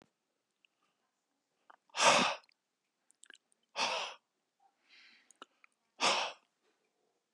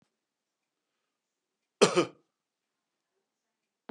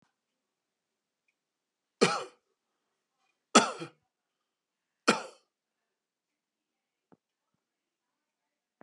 {"exhalation_length": "7.3 s", "exhalation_amplitude": 8564, "exhalation_signal_mean_std_ratio": 0.28, "cough_length": "3.9 s", "cough_amplitude": 13346, "cough_signal_mean_std_ratio": 0.17, "three_cough_length": "8.8 s", "three_cough_amplitude": 17274, "three_cough_signal_mean_std_ratio": 0.16, "survey_phase": "beta (2021-08-13 to 2022-03-07)", "age": "65+", "gender": "Male", "wearing_mask": "No", "symptom_none": true, "smoker_status": "Never smoked", "respiratory_condition_asthma": false, "respiratory_condition_other": false, "recruitment_source": "REACT", "submission_delay": "3 days", "covid_test_result": "Negative", "covid_test_method": "RT-qPCR", "influenza_a_test_result": "Negative", "influenza_b_test_result": "Negative"}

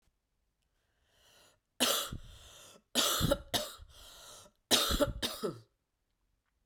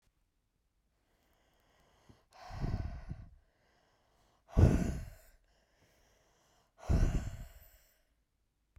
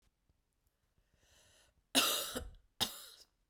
{"three_cough_length": "6.7 s", "three_cough_amplitude": 10185, "three_cough_signal_mean_std_ratio": 0.4, "exhalation_length": "8.8 s", "exhalation_amplitude": 7574, "exhalation_signal_mean_std_ratio": 0.29, "cough_length": "3.5 s", "cough_amplitude": 5979, "cough_signal_mean_std_ratio": 0.32, "survey_phase": "beta (2021-08-13 to 2022-03-07)", "age": "18-44", "gender": "Female", "wearing_mask": "No", "symptom_cough_any": true, "symptom_sore_throat": true, "symptom_fatigue": true, "symptom_fever_high_temperature": true, "symptom_headache": true, "symptom_change_to_sense_of_smell_or_taste": true, "symptom_onset": "3 days", "smoker_status": "Ex-smoker", "respiratory_condition_asthma": false, "respiratory_condition_other": false, "recruitment_source": "Test and Trace", "submission_delay": "2 days", "covid_test_result": "Positive", "covid_test_method": "RT-qPCR", "covid_ct_value": 16.0, "covid_ct_gene": "ORF1ab gene", "covid_ct_mean": 16.4, "covid_viral_load": "4200000 copies/ml", "covid_viral_load_category": "High viral load (>1M copies/ml)"}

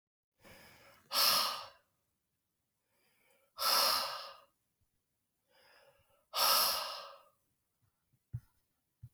{"exhalation_length": "9.1 s", "exhalation_amplitude": 5024, "exhalation_signal_mean_std_ratio": 0.36, "survey_phase": "beta (2021-08-13 to 2022-03-07)", "age": "65+", "gender": "Male", "wearing_mask": "No", "symptom_cough_any": true, "symptom_new_continuous_cough": true, "symptom_runny_or_blocked_nose": true, "symptom_shortness_of_breath": true, "symptom_fatigue": true, "symptom_headache": true, "symptom_change_to_sense_of_smell_or_taste": true, "symptom_loss_of_taste": true, "symptom_onset": "6 days", "smoker_status": "Never smoked", "respiratory_condition_asthma": false, "respiratory_condition_other": false, "recruitment_source": "Test and Trace", "submission_delay": "2 days", "covid_test_result": "Positive", "covid_test_method": "RT-qPCR", "covid_ct_value": 15.4, "covid_ct_gene": "ORF1ab gene", "covid_ct_mean": 15.6, "covid_viral_load": "7600000 copies/ml", "covid_viral_load_category": "High viral load (>1M copies/ml)"}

